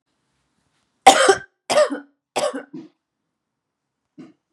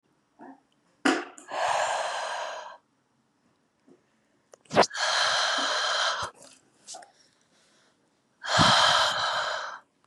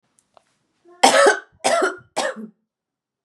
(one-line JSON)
{"three_cough_length": "4.5 s", "three_cough_amplitude": 32768, "three_cough_signal_mean_std_ratio": 0.29, "exhalation_length": "10.1 s", "exhalation_amplitude": 16504, "exhalation_signal_mean_std_ratio": 0.51, "cough_length": "3.2 s", "cough_amplitude": 32767, "cough_signal_mean_std_ratio": 0.38, "survey_phase": "beta (2021-08-13 to 2022-03-07)", "age": "18-44", "gender": "Female", "wearing_mask": "No", "symptom_none": true, "smoker_status": "Current smoker (1 to 10 cigarettes per day)", "respiratory_condition_asthma": false, "respiratory_condition_other": false, "recruitment_source": "REACT", "submission_delay": "1 day", "covid_test_result": "Negative", "covid_test_method": "RT-qPCR", "influenza_a_test_result": "Negative", "influenza_b_test_result": "Negative"}